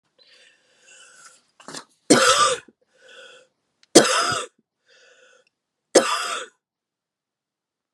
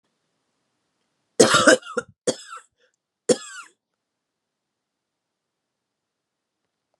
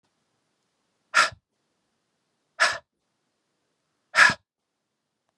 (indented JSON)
{
  "three_cough_length": "7.9 s",
  "three_cough_amplitude": 32768,
  "three_cough_signal_mean_std_ratio": 0.3,
  "cough_length": "7.0 s",
  "cough_amplitude": 32767,
  "cough_signal_mean_std_ratio": 0.21,
  "exhalation_length": "5.4 s",
  "exhalation_amplitude": 22990,
  "exhalation_signal_mean_std_ratio": 0.22,
  "survey_phase": "beta (2021-08-13 to 2022-03-07)",
  "age": "45-64",
  "gender": "Female",
  "wearing_mask": "No",
  "symptom_cough_any": true,
  "symptom_runny_or_blocked_nose": true,
  "symptom_fatigue": true,
  "symptom_change_to_sense_of_smell_or_taste": true,
  "symptom_onset": "5 days",
  "smoker_status": "Never smoked",
  "respiratory_condition_asthma": false,
  "respiratory_condition_other": false,
  "recruitment_source": "Test and Trace",
  "submission_delay": "1 day",
  "covid_test_result": "Positive",
  "covid_test_method": "RT-qPCR",
  "covid_ct_value": 11.9,
  "covid_ct_gene": "ORF1ab gene"
}